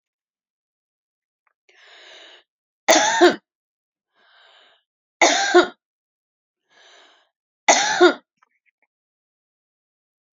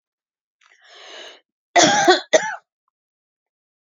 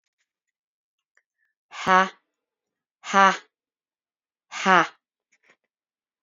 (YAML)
three_cough_length: 10.3 s
three_cough_amplitude: 31296
three_cough_signal_mean_std_ratio: 0.27
cough_length: 3.9 s
cough_amplitude: 32767
cough_signal_mean_std_ratio: 0.31
exhalation_length: 6.2 s
exhalation_amplitude: 26287
exhalation_signal_mean_std_ratio: 0.22
survey_phase: beta (2021-08-13 to 2022-03-07)
age: 45-64
gender: Female
wearing_mask: 'No'
symptom_none: true
smoker_status: Ex-smoker
respiratory_condition_asthma: false
respiratory_condition_other: false
recruitment_source: REACT
submission_delay: 0 days
covid_test_result: Negative
covid_test_method: RT-qPCR
influenza_a_test_result: Negative
influenza_b_test_result: Negative